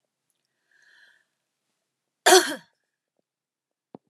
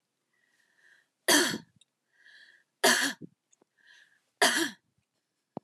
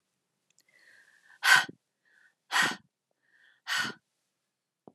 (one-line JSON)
{"cough_length": "4.1 s", "cough_amplitude": 26446, "cough_signal_mean_std_ratio": 0.18, "three_cough_length": "5.6 s", "three_cough_amplitude": 11384, "three_cough_signal_mean_std_ratio": 0.31, "exhalation_length": "4.9 s", "exhalation_amplitude": 14049, "exhalation_signal_mean_std_ratio": 0.26, "survey_phase": "beta (2021-08-13 to 2022-03-07)", "age": "45-64", "gender": "Female", "wearing_mask": "No", "symptom_cough_any": true, "symptom_fatigue": true, "smoker_status": "Never smoked", "respiratory_condition_asthma": false, "respiratory_condition_other": false, "recruitment_source": "REACT", "submission_delay": "4 days", "covid_test_result": "Negative", "covid_test_method": "RT-qPCR", "influenza_a_test_result": "Negative", "influenza_b_test_result": "Negative"}